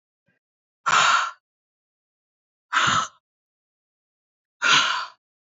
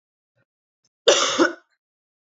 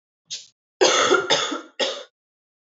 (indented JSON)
{
  "exhalation_length": "5.5 s",
  "exhalation_amplitude": 19030,
  "exhalation_signal_mean_std_ratio": 0.37,
  "cough_length": "2.2 s",
  "cough_amplitude": 28507,
  "cough_signal_mean_std_ratio": 0.32,
  "three_cough_length": "2.6 s",
  "three_cough_amplitude": 23836,
  "three_cough_signal_mean_std_ratio": 0.48,
  "survey_phase": "beta (2021-08-13 to 2022-03-07)",
  "age": "18-44",
  "gender": "Female",
  "wearing_mask": "No",
  "symptom_new_continuous_cough": true,
  "symptom_fatigue": true,
  "symptom_headache": true,
  "symptom_onset": "2 days",
  "smoker_status": "Never smoked",
  "respiratory_condition_asthma": true,
  "respiratory_condition_other": false,
  "recruitment_source": "Test and Trace",
  "submission_delay": "1 day",
  "covid_test_result": "Positive",
  "covid_test_method": "RT-qPCR",
  "covid_ct_value": 17.3,
  "covid_ct_gene": "ORF1ab gene",
  "covid_ct_mean": 17.4,
  "covid_viral_load": "2000000 copies/ml",
  "covid_viral_load_category": "High viral load (>1M copies/ml)"
}